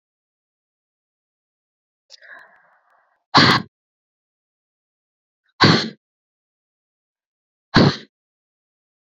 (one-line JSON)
{"exhalation_length": "9.1 s", "exhalation_amplitude": 29757, "exhalation_signal_mean_std_ratio": 0.22, "survey_phase": "beta (2021-08-13 to 2022-03-07)", "age": "45-64", "gender": "Female", "wearing_mask": "No", "symptom_cough_any": true, "symptom_runny_or_blocked_nose": true, "symptom_shortness_of_breath": true, "symptom_abdominal_pain": true, "symptom_diarrhoea": true, "symptom_fatigue": true, "symptom_onset": "5 days", "smoker_status": "Ex-smoker", "respiratory_condition_asthma": false, "respiratory_condition_other": false, "recruitment_source": "Test and Trace", "submission_delay": "2 days", "covid_test_result": "Positive", "covid_test_method": "RT-qPCR", "covid_ct_value": 15.8, "covid_ct_gene": "ORF1ab gene", "covid_ct_mean": 16.3, "covid_viral_load": "4400000 copies/ml", "covid_viral_load_category": "High viral load (>1M copies/ml)"}